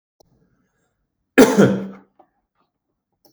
{
  "cough_length": "3.3 s",
  "cough_amplitude": 32767,
  "cough_signal_mean_std_ratio": 0.26,
  "survey_phase": "beta (2021-08-13 to 2022-03-07)",
  "age": "45-64",
  "gender": "Male",
  "wearing_mask": "No",
  "symptom_none": true,
  "smoker_status": "Never smoked",
  "respiratory_condition_asthma": false,
  "respiratory_condition_other": false,
  "recruitment_source": "REACT",
  "submission_delay": "4 days",
  "covid_test_result": "Negative",
  "covid_test_method": "RT-qPCR",
  "influenza_a_test_result": "Negative",
  "influenza_b_test_result": "Negative"
}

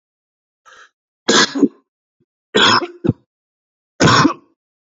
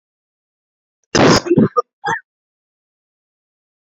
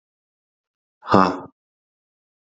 {
  "three_cough_length": "4.9 s",
  "three_cough_amplitude": 31592,
  "three_cough_signal_mean_std_ratio": 0.37,
  "cough_length": "3.8 s",
  "cough_amplitude": 30097,
  "cough_signal_mean_std_ratio": 0.32,
  "exhalation_length": "2.6 s",
  "exhalation_amplitude": 30974,
  "exhalation_signal_mean_std_ratio": 0.22,
  "survey_phase": "beta (2021-08-13 to 2022-03-07)",
  "age": "18-44",
  "gender": "Male",
  "wearing_mask": "No",
  "symptom_runny_or_blocked_nose": true,
  "symptom_sore_throat": true,
  "symptom_diarrhoea": true,
  "symptom_headache": true,
  "symptom_onset": "3 days",
  "smoker_status": "Never smoked",
  "respiratory_condition_asthma": false,
  "respiratory_condition_other": false,
  "recruitment_source": "REACT",
  "submission_delay": "2 days",
  "covid_test_result": "Negative",
  "covid_test_method": "RT-qPCR"
}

